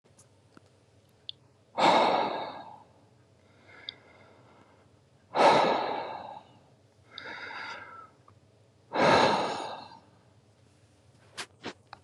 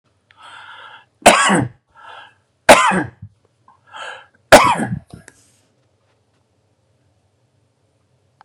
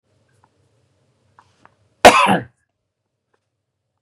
{"exhalation_length": "12.0 s", "exhalation_amplitude": 12158, "exhalation_signal_mean_std_ratio": 0.38, "three_cough_length": "8.4 s", "three_cough_amplitude": 32768, "three_cough_signal_mean_std_ratio": 0.28, "cough_length": "4.0 s", "cough_amplitude": 32768, "cough_signal_mean_std_ratio": 0.21, "survey_phase": "beta (2021-08-13 to 2022-03-07)", "age": "45-64", "gender": "Male", "wearing_mask": "No", "symptom_none": true, "smoker_status": "Ex-smoker", "respiratory_condition_asthma": false, "respiratory_condition_other": false, "recruitment_source": "REACT", "submission_delay": "1 day", "covid_test_result": "Negative", "covid_test_method": "RT-qPCR", "influenza_a_test_result": "Negative", "influenza_b_test_result": "Negative"}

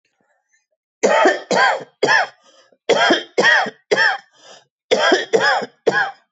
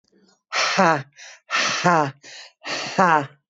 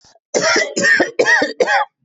{"three_cough_length": "6.3 s", "three_cough_amplitude": 25383, "three_cough_signal_mean_std_ratio": 0.56, "exhalation_length": "3.5 s", "exhalation_amplitude": 23104, "exhalation_signal_mean_std_ratio": 0.52, "cough_length": "2.0 s", "cough_amplitude": 24788, "cough_signal_mean_std_ratio": 0.73, "survey_phase": "beta (2021-08-13 to 2022-03-07)", "age": "45-64", "gender": "Female", "wearing_mask": "No", "symptom_none": true, "smoker_status": "Ex-smoker", "respiratory_condition_asthma": false, "respiratory_condition_other": false, "recruitment_source": "REACT", "submission_delay": "1 day", "covid_test_result": "Negative", "covid_test_method": "RT-qPCR", "influenza_a_test_result": "Negative", "influenza_b_test_result": "Negative"}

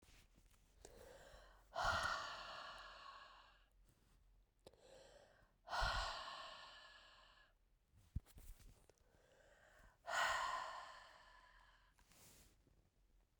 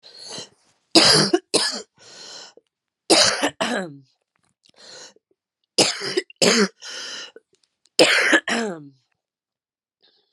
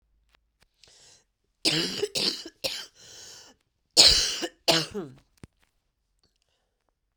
{"exhalation_length": "13.4 s", "exhalation_amplitude": 1377, "exhalation_signal_mean_std_ratio": 0.44, "three_cough_length": "10.3 s", "three_cough_amplitude": 32767, "three_cough_signal_mean_std_ratio": 0.4, "cough_length": "7.2 s", "cough_amplitude": 31789, "cough_signal_mean_std_ratio": 0.32, "survey_phase": "beta (2021-08-13 to 2022-03-07)", "age": "45-64", "gender": "Female", "wearing_mask": "No", "symptom_new_continuous_cough": true, "symptom_shortness_of_breath": true, "symptom_fatigue": true, "symptom_loss_of_taste": true, "symptom_onset": "5 days", "smoker_status": "Never smoked", "respiratory_condition_asthma": true, "respiratory_condition_other": false, "recruitment_source": "Test and Trace", "submission_delay": "1 day", "covid_test_result": "Positive", "covid_test_method": "RT-qPCR", "covid_ct_value": 18.8, "covid_ct_gene": "ORF1ab gene", "covid_ct_mean": 19.7, "covid_viral_load": "340000 copies/ml", "covid_viral_load_category": "Low viral load (10K-1M copies/ml)"}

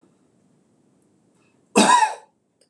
{"cough_length": "2.7 s", "cough_amplitude": 25813, "cough_signal_mean_std_ratio": 0.3, "survey_phase": "beta (2021-08-13 to 2022-03-07)", "age": "45-64", "gender": "Male", "wearing_mask": "No", "symptom_none": true, "smoker_status": "Never smoked", "respiratory_condition_asthma": false, "respiratory_condition_other": false, "recruitment_source": "REACT", "submission_delay": "3 days", "covid_test_result": "Negative", "covid_test_method": "RT-qPCR", "influenza_a_test_result": "Negative", "influenza_b_test_result": "Negative"}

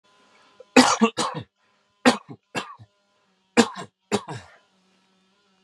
{"three_cough_length": "5.6 s", "three_cough_amplitude": 32767, "three_cough_signal_mean_std_ratio": 0.28, "survey_phase": "beta (2021-08-13 to 2022-03-07)", "age": "45-64", "gender": "Male", "wearing_mask": "No", "symptom_runny_or_blocked_nose": true, "symptom_abdominal_pain": true, "symptom_fatigue": true, "symptom_other": true, "symptom_onset": "10 days", "smoker_status": "Never smoked", "respiratory_condition_asthma": false, "respiratory_condition_other": false, "recruitment_source": "REACT", "submission_delay": "1 day", "covid_test_result": "Negative", "covid_test_method": "RT-qPCR", "covid_ct_value": 43.0, "covid_ct_gene": "N gene"}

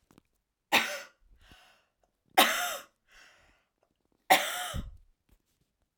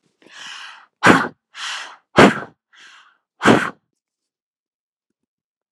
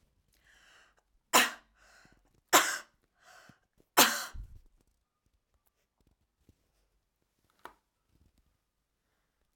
{"three_cough_length": "6.0 s", "three_cough_amplitude": 16189, "three_cough_signal_mean_std_ratio": 0.29, "exhalation_length": "5.7 s", "exhalation_amplitude": 32768, "exhalation_signal_mean_std_ratio": 0.28, "cough_length": "9.6 s", "cough_amplitude": 15981, "cough_signal_mean_std_ratio": 0.2, "survey_phase": "alpha (2021-03-01 to 2021-08-12)", "age": "45-64", "gender": "Female", "wearing_mask": "No", "symptom_none": true, "smoker_status": "Never smoked", "respiratory_condition_asthma": false, "respiratory_condition_other": false, "recruitment_source": "REACT", "submission_delay": "2 days", "covid_test_result": "Negative", "covid_test_method": "RT-qPCR"}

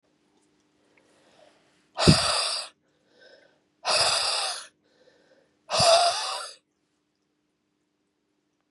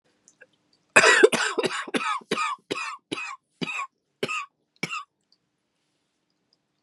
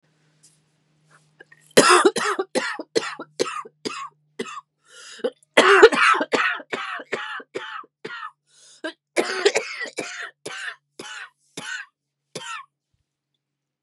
{"exhalation_length": "8.7 s", "exhalation_amplitude": 24997, "exhalation_signal_mean_std_ratio": 0.37, "cough_length": "6.8 s", "cough_amplitude": 28534, "cough_signal_mean_std_ratio": 0.36, "three_cough_length": "13.8 s", "three_cough_amplitude": 32768, "three_cough_signal_mean_std_ratio": 0.36, "survey_phase": "beta (2021-08-13 to 2022-03-07)", "age": "18-44", "gender": "Female", "wearing_mask": "No", "symptom_cough_any": true, "symptom_runny_or_blocked_nose": true, "symptom_shortness_of_breath": true, "symptom_sore_throat": true, "symptom_abdominal_pain": true, "symptom_fatigue": true, "symptom_fever_high_temperature": true, "symptom_headache": true, "symptom_change_to_sense_of_smell_or_taste": true, "symptom_loss_of_taste": true, "symptom_onset": "3 days", "smoker_status": "Ex-smoker", "respiratory_condition_asthma": false, "respiratory_condition_other": false, "recruitment_source": "Test and Trace", "submission_delay": "2 days", "covid_test_result": "Positive", "covid_test_method": "RT-qPCR", "covid_ct_value": 16.7, "covid_ct_gene": "ORF1ab gene", "covid_ct_mean": 17.3, "covid_viral_load": "2100000 copies/ml", "covid_viral_load_category": "High viral load (>1M copies/ml)"}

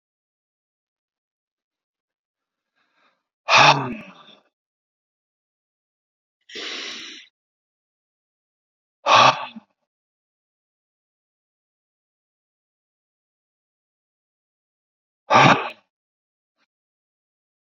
{"exhalation_length": "17.7 s", "exhalation_amplitude": 29222, "exhalation_signal_mean_std_ratio": 0.2, "survey_phase": "beta (2021-08-13 to 2022-03-07)", "age": "45-64", "gender": "Male", "wearing_mask": "No", "symptom_none": true, "smoker_status": "Never smoked", "respiratory_condition_asthma": false, "respiratory_condition_other": false, "recruitment_source": "REACT", "submission_delay": "2 days", "covid_test_result": "Negative", "covid_test_method": "RT-qPCR", "influenza_a_test_result": "Negative", "influenza_b_test_result": "Negative"}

